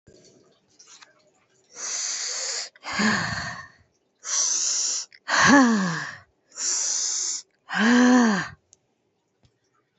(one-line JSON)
{"exhalation_length": "10.0 s", "exhalation_amplitude": 25290, "exhalation_signal_mean_std_ratio": 0.53, "survey_phase": "beta (2021-08-13 to 2022-03-07)", "age": "45-64", "gender": "Female", "wearing_mask": "No", "symptom_shortness_of_breath": true, "symptom_fatigue": true, "symptom_headache": true, "symptom_onset": "11 days", "smoker_status": "Ex-smoker", "respiratory_condition_asthma": false, "respiratory_condition_other": true, "recruitment_source": "REACT", "submission_delay": "3 days", "covid_test_result": "Negative", "covid_test_method": "RT-qPCR", "influenza_a_test_result": "Negative", "influenza_b_test_result": "Negative"}